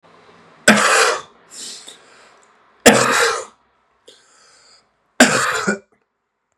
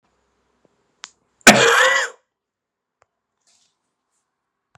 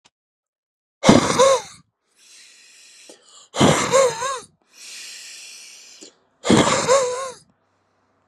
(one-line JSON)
{"three_cough_length": "6.6 s", "three_cough_amplitude": 32768, "three_cough_signal_mean_std_ratio": 0.39, "cough_length": "4.8 s", "cough_amplitude": 32768, "cough_signal_mean_std_ratio": 0.26, "exhalation_length": "8.3 s", "exhalation_amplitude": 32768, "exhalation_signal_mean_std_ratio": 0.41, "survey_phase": "beta (2021-08-13 to 2022-03-07)", "age": "18-44", "gender": "Male", "wearing_mask": "No", "symptom_other": true, "smoker_status": "Never smoked", "respiratory_condition_asthma": false, "respiratory_condition_other": false, "recruitment_source": "Test and Trace", "submission_delay": "1 day", "covid_test_result": "Positive", "covid_test_method": "RT-qPCR", "covid_ct_value": 25.5, "covid_ct_gene": "ORF1ab gene"}